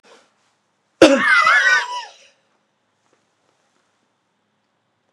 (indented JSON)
{
  "cough_length": "5.1 s",
  "cough_amplitude": 32768,
  "cough_signal_mean_std_ratio": 0.33,
  "survey_phase": "beta (2021-08-13 to 2022-03-07)",
  "age": "65+",
  "gender": "Male",
  "wearing_mask": "No",
  "symptom_none": true,
  "smoker_status": "Ex-smoker",
  "respiratory_condition_asthma": false,
  "respiratory_condition_other": true,
  "recruitment_source": "REACT",
  "submission_delay": "1 day",
  "covid_test_result": "Negative",
  "covid_test_method": "RT-qPCR",
  "influenza_a_test_result": "Negative",
  "influenza_b_test_result": "Negative"
}